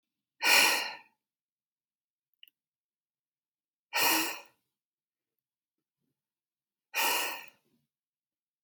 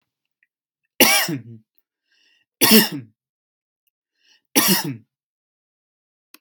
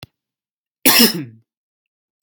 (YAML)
exhalation_length: 8.6 s
exhalation_amplitude: 10584
exhalation_signal_mean_std_ratio: 0.3
three_cough_length: 6.4 s
three_cough_amplitude: 32768
three_cough_signal_mean_std_ratio: 0.3
cough_length: 2.2 s
cough_amplitude: 32768
cough_signal_mean_std_ratio: 0.3
survey_phase: beta (2021-08-13 to 2022-03-07)
age: 18-44
gender: Male
wearing_mask: 'No'
symptom_sore_throat: true
symptom_onset: 2 days
smoker_status: Never smoked
respiratory_condition_asthma: true
respiratory_condition_other: false
recruitment_source: Test and Trace
submission_delay: 1 day
covid_test_result: Positive
covid_test_method: ePCR